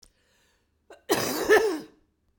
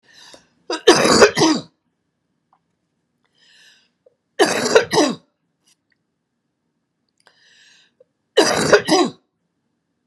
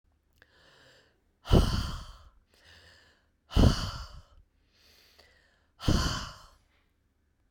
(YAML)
cough_length: 2.4 s
cough_amplitude: 15197
cough_signal_mean_std_ratio: 0.4
three_cough_length: 10.1 s
three_cough_amplitude: 32768
three_cough_signal_mean_std_ratio: 0.34
exhalation_length: 7.5 s
exhalation_amplitude: 13875
exhalation_signal_mean_std_ratio: 0.3
survey_phase: beta (2021-08-13 to 2022-03-07)
age: 65+
gender: Female
wearing_mask: 'No'
symptom_none: true
symptom_onset: 7 days
smoker_status: Ex-smoker
respiratory_condition_asthma: false
respiratory_condition_other: false
recruitment_source: REACT
submission_delay: 4 days
covid_test_result: Negative
covid_test_method: RT-qPCR
influenza_a_test_result: Negative
influenza_b_test_result: Negative